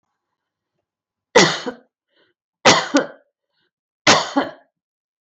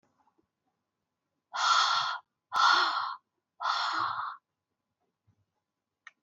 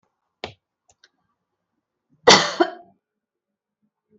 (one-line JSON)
{"three_cough_length": "5.2 s", "three_cough_amplitude": 32768, "three_cough_signal_mean_std_ratio": 0.31, "exhalation_length": "6.2 s", "exhalation_amplitude": 9131, "exhalation_signal_mean_std_ratio": 0.44, "cough_length": "4.2 s", "cough_amplitude": 32768, "cough_signal_mean_std_ratio": 0.2, "survey_phase": "beta (2021-08-13 to 2022-03-07)", "age": "65+", "gender": "Female", "wearing_mask": "No", "symptom_runny_or_blocked_nose": true, "symptom_abdominal_pain": true, "symptom_fatigue": true, "symptom_headache": true, "smoker_status": "Ex-smoker", "respiratory_condition_asthma": false, "respiratory_condition_other": false, "recruitment_source": "Test and Trace", "submission_delay": "0 days", "covid_test_result": "Positive", "covid_test_method": "LFT"}